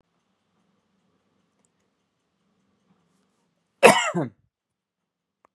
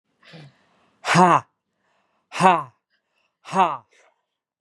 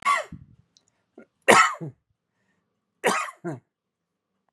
{"cough_length": "5.5 s", "cough_amplitude": 32659, "cough_signal_mean_std_ratio": 0.17, "exhalation_length": "4.6 s", "exhalation_amplitude": 32122, "exhalation_signal_mean_std_ratio": 0.31, "three_cough_length": "4.5 s", "three_cough_amplitude": 30633, "three_cough_signal_mean_std_ratio": 0.3, "survey_phase": "beta (2021-08-13 to 2022-03-07)", "age": "45-64", "gender": "Male", "wearing_mask": "No", "symptom_cough_any": true, "symptom_onset": "12 days", "smoker_status": "Ex-smoker", "respiratory_condition_asthma": false, "respiratory_condition_other": false, "recruitment_source": "REACT", "submission_delay": "14 days", "covid_test_result": "Negative", "covid_test_method": "RT-qPCR", "influenza_a_test_result": "Negative", "influenza_b_test_result": "Negative"}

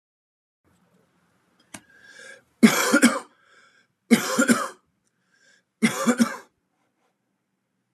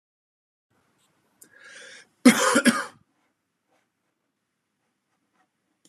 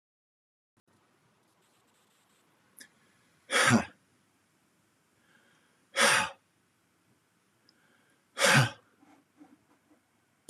{"three_cough_length": "7.9 s", "three_cough_amplitude": 29248, "three_cough_signal_mean_std_ratio": 0.31, "cough_length": "5.9 s", "cough_amplitude": 26999, "cough_signal_mean_std_ratio": 0.22, "exhalation_length": "10.5 s", "exhalation_amplitude": 10244, "exhalation_signal_mean_std_ratio": 0.25, "survey_phase": "beta (2021-08-13 to 2022-03-07)", "age": "45-64", "gender": "Male", "wearing_mask": "No", "symptom_none": true, "smoker_status": "Ex-smoker", "respiratory_condition_asthma": false, "respiratory_condition_other": false, "recruitment_source": "REACT", "submission_delay": "3 days", "covid_test_result": "Negative", "covid_test_method": "RT-qPCR"}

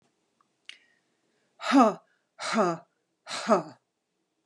{"exhalation_length": "4.5 s", "exhalation_amplitude": 15860, "exhalation_signal_mean_std_ratio": 0.33, "survey_phase": "beta (2021-08-13 to 2022-03-07)", "age": "65+", "gender": "Female", "wearing_mask": "No", "symptom_none": true, "smoker_status": "Ex-smoker", "respiratory_condition_asthma": false, "respiratory_condition_other": false, "recruitment_source": "REACT", "submission_delay": "1 day", "covid_test_result": "Negative", "covid_test_method": "RT-qPCR", "influenza_a_test_result": "Negative", "influenza_b_test_result": "Negative"}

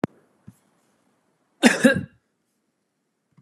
{"cough_length": "3.4 s", "cough_amplitude": 31219, "cough_signal_mean_std_ratio": 0.23, "survey_phase": "beta (2021-08-13 to 2022-03-07)", "age": "65+", "gender": "Female", "wearing_mask": "No", "symptom_none": true, "smoker_status": "Never smoked", "respiratory_condition_asthma": false, "respiratory_condition_other": false, "recruitment_source": "REACT", "submission_delay": "4 days", "covid_test_result": "Negative", "covid_test_method": "RT-qPCR"}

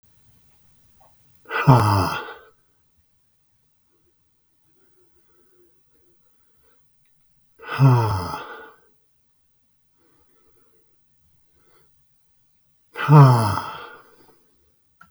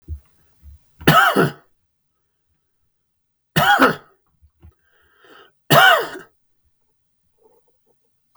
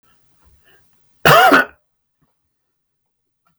{"exhalation_length": "15.1 s", "exhalation_amplitude": 32766, "exhalation_signal_mean_std_ratio": 0.27, "three_cough_length": "8.4 s", "three_cough_amplitude": 32768, "three_cough_signal_mean_std_ratio": 0.31, "cough_length": "3.6 s", "cough_amplitude": 32768, "cough_signal_mean_std_ratio": 0.28, "survey_phase": "beta (2021-08-13 to 2022-03-07)", "age": "65+", "gender": "Male", "wearing_mask": "No", "symptom_cough_any": true, "smoker_status": "Ex-smoker", "respiratory_condition_asthma": false, "respiratory_condition_other": false, "recruitment_source": "REACT", "submission_delay": "2 days", "covid_test_result": "Negative", "covid_test_method": "RT-qPCR", "influenza_a_test_result": "Negative", "influenza_b_test_result": "Negative"}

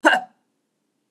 {"cough_length": "1.1 s", "cough_amplitude": 30760, "cough_signal_mean_std_ratio": 0.3, "survey_phase": "beta (2021-08-13 to 2022-03-07)", "age": "65+", "gender": "Female", "wearing_mask": "No", "symptom_abdominal_pain": true, "smoker_status": "Never smoked", "respiratory_condition_asthma": false, "respiratory_condition_other": false, "recruitment_source": "REACT", "submission_delay": "5 days", "covid_test_result": "Negative", "covid_test_method": "RT-qPCR", "influenza_a_test_result": "Negative", "influenza_b_test_result": "Negative"}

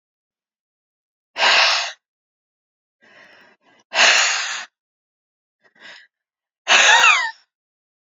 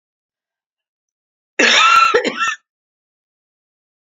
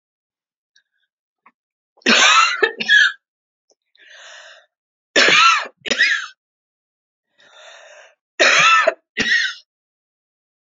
{"exhalation_length": "8.2 s", "exhalation_amplitude": 29000, "exhalation_signal_mean_std_ratio": 0.36, "cough_length": "4.1 s", "cough_amplitude": 30479, "cough_signal_mean_std_ratio": 0.38, "three_cough_length": "10.8 s", "three_cough_amplitude": 30109, "three_cough_signal_mean_std_ratio": 0.4, "survey_phase": "beta (2021-08-13 to 2022-03-07)", "age": "65+", "gender": "Female", "wearing_mask": "No", "symptom_none": true, "smoker_status": "Never smoked", "respiratory_condition_asthma": false, "respiratory_condition_other": false, "recruitment_source": "REACT", "submission_delay": "1 day", "covid_test_result": "Negative", "covid_test_method": "RT-qPCR"}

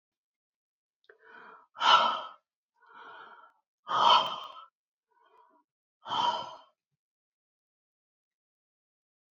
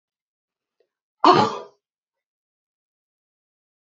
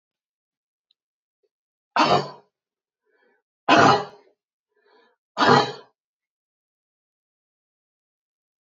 {"exhalation_length": "9.3 s", "exhalation_amplitude": 12877, "exhalation_signal_mean_std_ratio": 0.28, "cough_length": "3.8 s", "cough_amplitude": 27324, "cough_signal_mean_std_ratio": 0.21, "three_cough_length": "8.6 s", "three_cough_amplitude": 26400, "three_cough_signal_mean_std_ratio": 0.25, "survey_phase": "beta (2021-08-13 to 2022-03-07)", "age": "65+", "gender": "Female", "wearing_mask": "No", "symptom_cough_any": true, "smoker_status": "Never smoked", "respiratory_condition_asthma": false, "respiratory_condition_other": false, "recruitment_source": "REACT", "submission_delay": "2 days", "covid_test_result": "Negative", "covid_test_method": "RT-qPCR"}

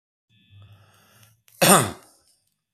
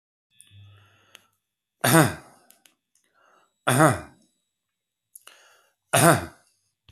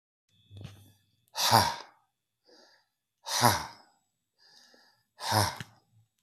{"cough_length": "2.7 s", "cough_amplitude": 32767, "cough_signal_mean_std_ratio": 0.25, "three_cough_length": "6.9 s", "three_cough_amplitude": 28032, "three_cough_signal_mean_std_ratio": 0.27, "exhalation_length": "6.2 s", "exhalation_amplitude": 20153, "exhalation_signal_mean_std_ratio": 0.31, "survey_phase": "beta (2021-08-13 to 2022-03-07)", "age": "45-64", "gender": "Male", "wearing_mask": "No", "symptom_none": true, "smoker_status": "Current smoker (11 or more cigarettes per day)", "respiratory_condition_asthma": true, "respiratory_condition_other": false, "recruitment_source": "REACT", "submission_delay": "4 days", "covid_test_result": "Negative", "covid_test_method": "RT-qPCR"}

